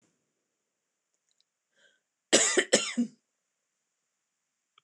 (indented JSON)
{
  "cough_length": "4.8 s",
  "cough_amplitude": 19541,
  "cough_signal_mean_std_ratio": 0.25,
  "survey_phase": "beta (2021-08-13 to 2022-03-07)",
  "age": "45-64",
  "gender": "Female",
  "wearing_mask": "No",
  "symptom_none": true,
  "smoker_status": "Never smoked",
  "respiratory_condition_asthma": false,
  "respiratory_condition_other": false,
  "recruitment_source": "REACT",
  "submission_delay": "2 days",
  "covid_test_result": "Negative",
  "covid_test_method": "RT-qPCR",
  "influenza_a_test_result": "Negative",
  "influenza_b_test_result": "Negative"
}